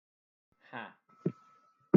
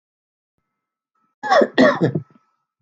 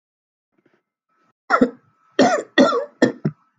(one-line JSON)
{"exhalation_length": "2.0 s", "exhalation_amplitude": 9759, "exhalation_signal_mean_std_ratio": 0.16, "cough_length": "2.8 s", "cough_amplitude": 27823, "cough_signal_mean_std_ratio": 0.36, "three_cough_length": "3.6 s", "three_cough_amplitude": 29605, "three_cough_signal_mean_std_ratio": 0.37, "survey_phase": "alpha (2021-03-01 to 2021-08-12)", "age": "18-44", "gender": "Male", "wearing_mask": "No", "symptom_headache": true, "smoker_status": "Never smoked", "respiratory_condition_asthma": false, "respiratory_condition_other": false, "recruitment_source": "REACT", "submission_delay": "2 days", "covid_test_result": "Negative", "covid_test_method": "RT-qPCR"}